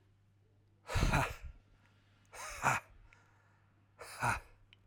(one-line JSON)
{"exhalation_length": "4.9 s", "exhalation_amplitude": 5043, "exhalation_signal_mean_std_ratio": 0.39, "survey_phase": "alpha (2021-03-01 to 2021-08-12)", "age": "45-64", "gender": "Male", "wearing_mask": "No", "symptom_none": true, "smoker_status": "Never smoked", "respiratory_condition_asthma": false, "respiratory_condition_other": false, "recruitment_source": "REACT", "submission_delay": "1 day", "covid_test_result": "Negative", "covid_test_method": "RT-qPCR"}